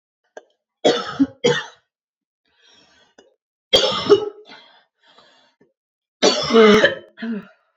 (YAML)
three_cough_length: 7.8 s
three_cough_amplitude: 29599
three_cough_signal_mean_std_ratio: 0.37
survey_phase: beta (2021-08-13 to 2022-03-07)
age: 18-44
gender: Female
wearing_mask: 'No'
symptom_cough_any: true
symptom_sore_throat: true
symptom_fever_high_temperature: true
symptom_headache: true
smoker_status: Ex-smoker
respiratory_condition_asthma: false
respiratory_condition_other: false
recruitment_source: Test and Trace
submission_delay: 2 days
covid_test_result: Positive
covid_test_method: RT-qPCR
covid_ct_value: 25.7
covid_ct_gene: ORF1ab gene
covid_ct_mean: 26.2
covid_viral_load: 2500 copies/ml
covid_viral_load_category: Minimal viral load (< 10K copies/ml)